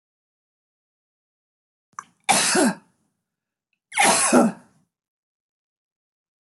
{"three_cough_length": "6.5 s", "three_cough_amplitude": 23164, "three_cough_signal_mean_std_ratio": 0.32, "survey_phase": "beta (2021-08-13 to 2022-03-07)", "age": "65+", "gender": "Female", "wearing_mask": "No", "symptom_cough_any": true, "symptom_fatigue": true, "smoker_status": "Ex-smoker", "respiratory_condition_asthma": false, "respiratory_condition_other": false, "recruitment_source": "REACT", "submission_delay": "2 days", "covid_test_result": "Negative", "covid_test_method": "RT-qPCR"}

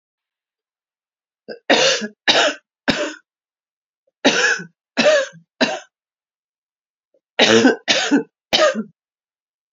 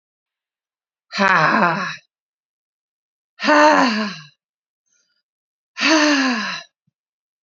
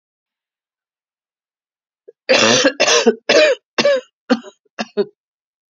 {"three_cough_length": "9.7 s", "three_cough_amplitude": 32767, "three_cough_signal_mean_std_ratio": 0.41, "exhalation_length": "7.4 s", "exhalation_amplitude": 29248, "exhalation_signal_mean_std_ratio": 0.43, "cough_length": "5.7 s", "cough_amplitude": 32767, "cough_signal_mean_std_ratio": 0.41, "survey_phase": "beta (2021-08-13 to 2022-03-07)", "age": "65+", "gender": "Female", "wearing_mask": "No", "symptom_new_continuous_cough": true, "symptom_runny_or_blocked_nose": true, "symptom_sore_throat": true, "symptom_fatigue": true, "symptom_headache": true, "symptom_change_to_sense_of_smell_or_taste": true, "smoker_status": "Ex-smoker", "respiratory_condition_asthma": false, "respiratory_condition_other": false, "recruitment_source": "Test and Trace", "submission_delay": "2 days", "covid_test_result": "Positive", "covid_test_method": "RT-qPCR"}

